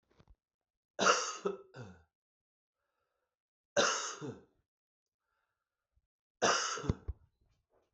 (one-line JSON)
{"three_cough_length": "7.9 s", "three_cough_amplitude": 6504, "three_cough_signal_mean_std_ratio": 0.32, "survey_phase": "beta (2021-08-13 to 2022-03-07)", "age": "65+", "gender": "Male", "wearing_mask": "No", "symptom_cough_any": true, "symptom_fatigue": true, "symptom_headache": true, "symptom_onset": "6 days", "smoker_status": "Never smoked", "respiratory_condition_asthma": false, "respiratory_condition_other": false, "recruitment_source": "Test and Trace", "submission_delay": "1 day", "covid_test_result": "Positive", "covid_test_method": "RT-qPCR"}